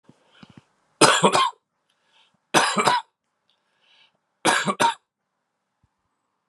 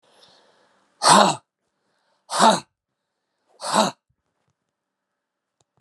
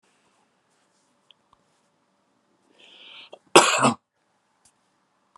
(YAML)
three_cough_length: 6.5 s
three_cough_amplitude: 32353
three_cough_signal_mean_std_ratio: 0.35
exhalation_length: 5.8 s
exhalation_amplitude: 31434
exhalation_signal_mean_std_ratio: 0.28
cough_length: 5.4 s
cough_amplitude: 32756
cough_signal_mean_std_ratio: 0.19
survey_phase: beta (2021-08-13 to 2022-03-07)
age: 65+
gender: Male
wearing_mask: 'No'
symptom_cough_any: true
symptom_runny_or_blocked_nose: true
symptom_fatigue: true
symptom_change_to_sense_of_smell_or_taste: true
symptom_loss_of_taste: true
symptom_onset: 3 days
smoker_status: Never smoked
respiratory_condition_asthma: false
respiratory_condition_other: false
recruitment_source: Test and Trace
submission_delay: 2 days
covid_test_result: Positive
covid_test_method: RT-qPCR
covid_ct_value: 18.4
covid_ct_gene: ORF1ab gene